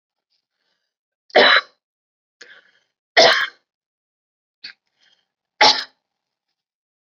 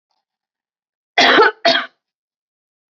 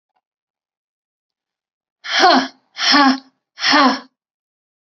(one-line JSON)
{"three_cough_length": "7.1 s", "three_cough_amplitude": 28878, "three_cough_signal_mean_std_ratio": 0.25, "cough_length": "2.9 s", "cough_amplitude": 30988, "cough_signal_mean_std_ratio": 0.34, "exhalation_length": "4.9 s", "exhalation_amplitude": 32344, "exhalation_signal_mean_std_ratio": 0.38, "survey_phase": "beta (2021-08-13 to 2022-03-07)", "age": "45-64", "gender": "Female", "wearing_mask": "No", "symptom_runny_or_blocked_nose": true, "symptom_sore_throat": true, "symptom_fatigue": true, "symptom_fever_high_temperature": true, "smoker_status": "Never smoked", "respiratory_condition_asthma": true, "respiratory_condition_other": false, "recruitment_source": "Test and Trace", "submission_delay": "2 days", "covid_test_result": "Negative", "covid_test_method": "LAMP"}